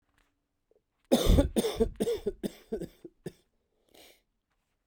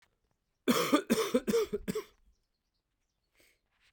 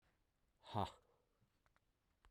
{"three_cough_length": "4.9 s", "three_cough_amplitude": 9961, "three_cough_signal_mean_std_ratio": 0.36, "cough_length": "3.9 s", "cough_amplitude": 7755, "cough_signal_mean_std_ratio": 0.4, "exhalation_length": "2.3 s", "exhalation_amplitude": 1448, "exhalation_signal_mean_std_ratio": 0.24, "survey_phase": "beta (2021-08-13 to 2022-03-07)", "age": "45-64", "gender": "Male", "wearing_mask": "No", "symptom_cough_any": true, "symptom_sore_throat": true, "symptom_abdominal_pain": true, "symptom_fatigue": true, "symptom_fever_high_temperature": true, "smoker_status": "Ex-smoker", "respiratory_condition_asthma": false, "respiratory_condition_other": false, "recruitment_source": "Test and Trace", "submission_delay": "3 days", "covid_test_result": "Positive", "covid_test_method": "RT-qPCR"}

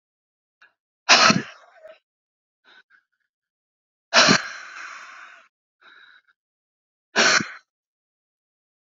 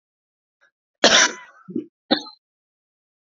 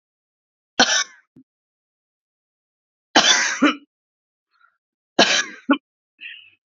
{"exhalation_length": "8.9 s", "exhalation_amplitude": 32054, "exhalation_signal_mean_std_ratio": 0.26, "cough_length": "3.2 s", "cough_amplitude": 32768, "cough_signal_mean_std_ratio": 0.27, "three_cough_length": "6.7 s", "three_cough_amplitude": 32767, "three_cough_signal_mean_std_ratio": 0.32, "survey_phase": "beta (2021-08-13 to 2022-03-07)", "age": "45-64", "gender": "Female", "wearing_mask": "No", "symptom_cough_any": true, "symptom_new_continuous_cough": true, "symptom_runny_or_blocked_nose": true, "symptom_sore_throat": true, "symptom_abdominal_pain": true, "symptom_fatigue": true, "symptom_headache": true, "symptom_change_to_sense_of_smell_or_taste": true, "symptom_loss_of_taste": true, "symptom_onset": "3 days", "smoker_status": "Current smoker (1 to 10 cigarettes per day)", "respiratory_condition_asthma": false, "respiratory_condition_other": false, "recruitment_source": "Test and Trace", "submission_delay": "1 day", "covid_test_result": "Positive", "covid_test_method": "ePCR"}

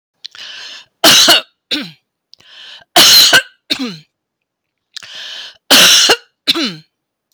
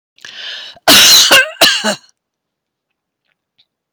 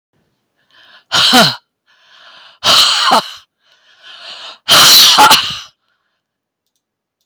{"three_cough_length": "7.3 s", "three_cough_amplitude": 32768, "three_cough_signal_mean_std_ratio": 0.45, "cough_length": "3.9 s", "cough_amplitude": 32768, "cough_signal_mean_std_ratio": 0.44, "exhalation_length": "7.3 s", "exhalation_amplitude": 32768, "exhalation_signal_mean_std_ratio": 0.46, "survey_phase": "beta (2021-08-13 to 2022-03-07)", "age": "65+", "gender": "Female", "wearing_mask": "No", "symptom_none": true, "smoker_status": "Ex-smoker", "respiratory_condition_asthma": false, "respiratory_condition_other": false, "recruitment_source": "REACT", "submission_delay": "3 days", "covid_test_result": "Negative", "covid_test_method": "RT-qPCR", "influenza_a_test_result": "Negative", "influenza_b_test_result": "Negative"}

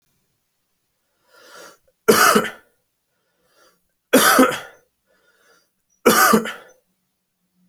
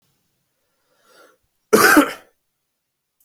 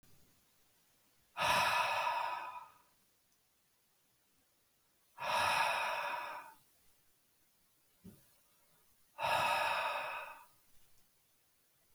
{"three_cough_length": "7.7 s", "three_cough_amplitude": 29186, "three_cough_signal_mean_std_ratio": 0.32, "cough_length": "3.2 s", "cough_amplitude": 30734, "cough_signal_mean_std_ratio": 0.27, "exhalation_length": "11.9 s", "exhalation_amplitude": 3340, "exhalation_signal_mean_std_ratio": 0.46, "survey_phase": "beta (2021-08-13 to 2022-03-07)", "age": "18-44", "gender": "Male", "wearing_mask": "No", "symptom_cough_any": true, "symptom_runny_or_blocked_nose": true, "symptom_onset": "4 days", "smoker_status": "Never smoked", "respiratory_condition_asthma": true, "respiratory_condition_other": false, "recruitment_source": "REACT", "submission_delay": "1 day", "covid_test_result": "Negative", "covid_test_method": "RT-qPCR", "influenza_a_test_result": "Negative", "influenza_b_test_result": "Negative"}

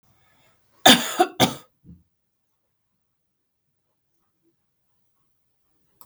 {"cough_length": "6.1 s", "cough_amplitude": 32768, "cough_signal_mean_std_ratio": 0.19, "survey_phase": "beta (2021-08-13 to 2022-03-07)", "age": "18-44", "gender": "Female", "wearing_mask": "No", "symptom_none": true, "smoker_status": "Never smoked", "respiratory_condition_asthma": false, "respiratory_condition_other": false, "recruitment_source": "REACT", "submission_delay": "2 days", "covid_test_result": "Negative", "covid_test_method": "RT-qPCR", "influenza_a_test_result": "Negative", "influenza_b_test_result": "Negative"}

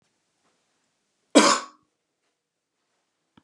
{"cough_length": "3.4 s", "cough_amplitude": 28214, "cough_signal_mean_std_ratio": 0.2, "survey_phase": "beta (2021-08-13 to 2022-03-07)", "age": "45-64", "gender": "Male", "wearing_mask": "No", "symptom_none": true, "smoker_status": "Never smoked", "respiratory_condition_asthma": false, "respiratory_condition_other": false, "recruitment_source": "REACT", "submission_delay": "3 days", "covid_test_result": "Negative", "covid_test_method": "RT-qPCR", "influenza_a_test_result": "Negative", "influenza_b_test_result": "Negative"}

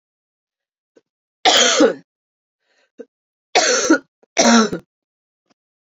{"three_cough_length": "5.9 s", "three_cough_amplitude": 30592, "three_cough_signal_mean_std_ratio": 0.38, "survey_phase": "beta (2021-08-13 to 2022-03-07)", "age": "45-64", "gender": "Female", "wearing_mask": "No", "symptom_cough_any": true, "symptom_runny_or_blocked_nose": true, "symptom_fatigue": true, "symptom_headache": true, "symptom_onset": "5 days", "smoker_status": "Never smoked", "respiratory_condition_asthma": false, "respiratory_condition_other": false, "recruitment_source": "Test and Trace", "submission_delay": "3 days", "covid_test_result": "Positive", "covid_test_method": "RT-qPCR"}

